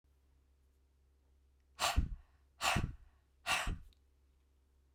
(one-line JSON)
{"exhalation_length": "4.9 s", "exhalation_amplitude": 4124, "exhalation_signal_mean_std_ratio": 0.36, "survey_phase": "beta (2021-08-13 to 2022-03-07)", "age": "18-44", "gender": "Female", "wearing_mask": "No", "symptom_cough_any": true, "symptom_fatigue": true, "symptom_headache": true, "symptom_change_to_sense_of_smell_or_taste": true, "smoker_status": "Never smoked", "respiratory_condition_asthma": false, "respiratory_condition_other": false, "recruitment_source": "Test and Trace", "submission_delay": "2 days", "covid_test_result": "Positive", "covid_test_method": "RT-qPCR"}